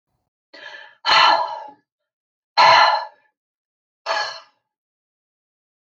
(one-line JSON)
{"exhalation_length": "6.0 s", "exhalation_amplitude": 31205, "exhalation_signal_mean_std_ratio": 0.35, "survey_phase": "beta (2021-08-13 to 2022-03-07)", "age": "65+", "gender": "Female", "wearing_mask": "No", "symptom_none": true, "smoker_status": "Never smoked", "respiratory_condition_asthma": false, "respiratory_condition_other": false, "recruitment_source": "REACT", "submission_delay": "2 days", "covid_test_result": "Negative", "covid_test_method": "RT-qPCR"}